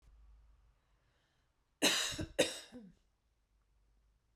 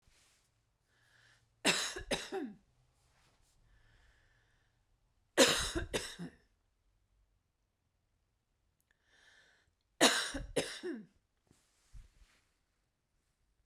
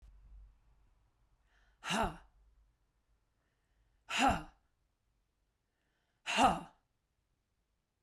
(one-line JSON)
{"cough_length": "4.4 s", "cough_amplitude": 5038, "cough_signal_mean_std_ratio": 0.3, "three_cough_length": "13.7 s", "three_cough_amplitude": 11225, "three_cough_signal_mean_std_ratio": 0.27, "exhalation_length": "8.0 s", "exhalation_amplitude": 5885, "exhalation_signal_mean_std_ratio": 0.27, "survey_phase": "beta (2021-08-13 to 2022-03-07)", "age": "65+", "gender": "Female", "wearing_mask": "No", "symptom_runny_or_blocked_nose": true, "symptom_fatigue": true, "symptom_fever_high_temperature": true, "symptom_headache": true, "smoker_status": "Never smoked", "respiratory_condition_asthma": true, "respiratory_condition_other": false, "recruitment_source": "Test and Trace", "submission_delay": "2 days", "covid_test_result": "Positive", "covid_test_method": "ePCR"}